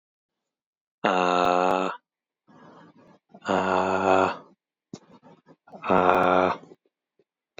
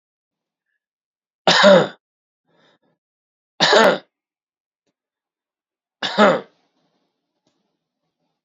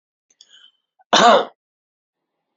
{"exhalation_length": "7.6 s", "exhalation_amplitude": 25553, "exhalation_signal_mean_std_ratio": 0.43, "three_cough_length": "8.4 s", "three_cough_amplitude": 29662, "three_cough_signal_mean_std_ratio": 0.28, "cough_length": "2.6 s", "cough_amplitude": 28119, "cough_signal_mean_std_ratio": 0.28, "survey_phase": "beta (2021-08-13 to 2022-03-07)", "age": "45-64", "gender": "Male", "wearing_mask": "No", "symptom_none": true, "symptom_onset": "12 days", "smoker_status": "Never smoked", "respiratory_condition_asthma": false, "respiratory_condition_other": false, "recruitment_source": "REACT", "submission_delay": "0 days", "covid_test_result": "Negative", "covid_test_method": "RT-qPCR", "influenza_a_test_result": "Negative", "influenza_b_test_result": "Negative"}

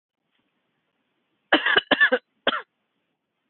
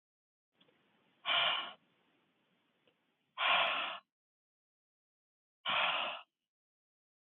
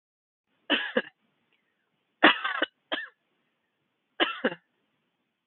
{"cough_length": "3.5 s", "cough_amplitude": 21397, "cough_signal_mean_std_ratio": 0.3, "exhalation_length": "7.3 s", "exhalation_amplitude": 3974, "exhalation_signal_mean_std_ratio": 0.37, "three_cough_length": "5.5 s", "three_cough_amplitude": 23270, "three_cough_signal_mean_std_ratio": 0.27, "survey_phase": "beta (2021-08-13 to 2022-03-07)", "age": "45-64", "gender": "Female", "wearing_mask": "No", "symptom_none": true, "smoker_status": "Never smoked", "respiratory_condition_asthma": false, "respiratory_condition_other": false, "recruitment_source": "REACT", "submission_delay": "1 day", "covid_test_result": "Negative", "covid_test_method": "RT-qPCR"}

